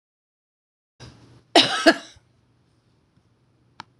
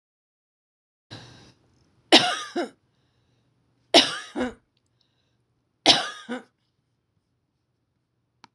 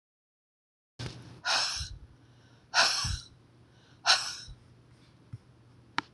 {
  "cough_length": "4.0 s",
  "cough_amplitude": 26028,
  "cough_signal_mean_std_ratio": 0.21,
  "three_cough_length": "8.5 s",
  "three_cough_amplitude": 26028,
  "three_cough_signal_mean_std_ratio": 0.23,
  "exhalation_length": "6.1 s",
  "exhalation_amplitude": 13271,
  "exhalation_signal_mean_std_ratio": 0.37,
  "survey_phase": "beta (2021-08-13 to 2022-03-07)",
  "age": "65+",
  "gender": "Female",
  "wearing_mask": "No",
  "symptom_none": true,
  "smoker_status": "Never smoked",
  "respiratory_condition_asthma": false,
  "respiratory_condition_other": false,
  "recruitment_source": "REACT",
  "submission_delay": "1 day",
  "covid_test_result": "Negative",
  "covid_test_method": "RT-qPCR",
  "influenza_a_test_result": "Negative",
  "influenza_b_test_result": "Negative"
}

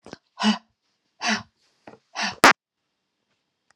{
  "exhalation_length": "3.8 s",
  "exhalation_amplitude": 32768,
  "exhalation_signal_mean_std_ratio": 0.22,
  "survey_phase": "alpha (2021-03-01 to 2021-08-12)",
  "age": "18-44",
  "gender": "Female",
  "wearing_mask": "No",
  "symptom_none": true,
  "smoker_status": "Never smoked",
  "respiratory_condition_asthma": false,
  "respiratory_condition_other": false,
  "recruitment_source": "REACT",
  "submission_delay": "1 day",
  "covid_test_result": "Negative",
  "covid_test_method": "RT-qPCR"
}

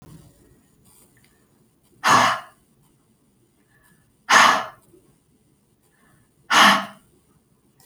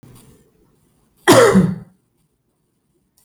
{
  "exhalation_length": "7.9 s",
  "exhalation_amplitude": 28868,
  "exhalation_signal_mean_std_ratio": 0.29,
  "cough_length": "3.2 s",
  "cough_amplitude": 30761,
  "cough_signal_mean_std_ratio": 0.32,
  "survey_phase": "beta (2021-08-13 to 2022-03-07)",
  "age": "45-64",
  "gender": "Female",
  "wearing_mask": "No",
  "symptom_none": true,
  "smoker_status": "Prefer not to say",
  "respiratory_condition_asthma": false,
  "respiratory_condition_other": false,
  "recruitment_source": "REACT",
  "submission_delay": "2 days",
  "covid_test_result": "Negative",
  "covid_test_method": "RT-qPCR"
}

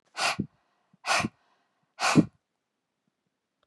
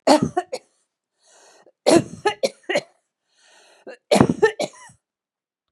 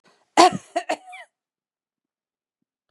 {
  "exhalation_length": "3.7 s",
  "exhalation_amplitude": 15886,
  "exhalation_signal_mean_std_ratio": 0.31,
  "three_cough_length": "5.7 s",
  "three_cough_amplitude": 32768,
  "three_cough_signal_mean_std_ratio": 0.32,
  "cough_length": "2.9 s",
  "cough_amplitude": 32491,
  "cough_signal_mean_std_ratio": 0.22,
  "survey_phase": "beta (2021-08-13 to 2022-03-07)",
  "age": "65+",
  "gender": "Female",
  "wearing_mask": "No",
  "symptom_none": true,
  "smoker_status": "Never smoked",
  "respiratory_condition_asthma": false,
  "respiratory_condition_other": false,
  "recruitment_source": "REACT",
  "submission_delay": "-1 day",
  "covid_test_result": "Negative",
  "covid_test_method": "RT-qPCR",
  "influenza_a_test_result": "Negative",
  "influenza_b_test_result": "Negative"
}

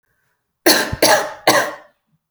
{
  "three_cough_length": "2.3 s",
  "three_cough_amplitude": 32767,
  "three_cough_signal_mean_std_ratio": 0.46,
  "survey_phase": "alpha (2021-03-01 to 2021-08-12)",
  "age": "18-44",
  "gender": "Female",
  "wearing_mask": "No",
  "symptom_none": true,
  "smoker_status": "Ex-smoker",
  "respiratory_condition_asthma": false,
  "respiratory_condition_other": false,
  "recruitment_source": "REACT",
  "submission_delay": "1 day",
  "covid_test_result": "Negative",
  "covid_test_method": "RT-qPCR"
}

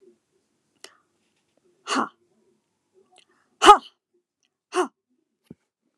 {
  "exhalation_length": "6.0 s",
  "exhalation_amplitude": 29204,
  "exhalation_signal_mean_std_ratio": 0.17,
  "survey_phase": "beta (2021-08-13 to 2022-03-07)",
  "age": "18-44",
  "gender": "Female",
  "wearing_mask": "Yes",
  "symptom_abdominal_pain": true,
  "symptom_fatigue": true,
  "symptom_headache": true,
  "smoker_status": "Never smoked",
  "respiratory_condition_asthma": true,
  "respiratory_condition_other": false,
  "recruitment_source": "REACT",
  "submission_delay": "4 days",
  "covid_test_result": "Negative",
  "covid_test_method": "RT-qPCR",
  "influenza_a_test_result": "Negative",
  "influenza_b_test_result": "Negative"
}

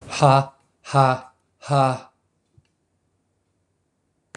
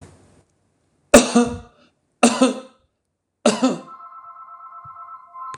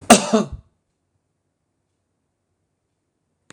{
  "exhalation_length": "4.4 s",
  "exhalation_amplitude": 24575,
  "exhalation_signal_mean_std_ratio": 0.33,
  "three_cough_length": "5.6 s",
  "three_cough_amplitude": 26028,
  "three_cough_signal_mean_std_ratio": 0.33,
  "cough_length": "3.5 s",
  "cough_amplitude": 26028,
  "cough_signal_mean_std_ratio": 0.2,
  "survey_phase": "beta (2021-08-13 to 2022-03-07)",
  "age": "65+",
  "gender": "Male",
  "wearing_mask": "No",
  "symptom_none": true,
  "smoker_status": "Ex-smoker",
  "respiratory_condition_asthma": false,
  "respiratory_condition_other": false,
  "recruitment_source": "REACT",
  "submission_delay": "0 days",
  "covid_test_result": "Negative",
  "covid_test_method": "RT-qPCR"
}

